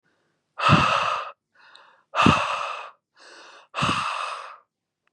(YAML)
exhalation_length: 5.1 s
exhalation_amplitude: 26123
exhalation_signal_mean_std_ratio: 0.47
survey_phase: beta (2021-08-13 to 2022-03-07)
age: 18-44
gender: Male
wearing_mask: 'No'
symptom_none: true
smoker_status: Never smoked
respiratory_condition_asthma: false
respiratory_condition_other: false
recruitment_source: Test and Trace
submission_delay: 0 days
covid_test_result: Negative
covid_test_method: RT-qPCR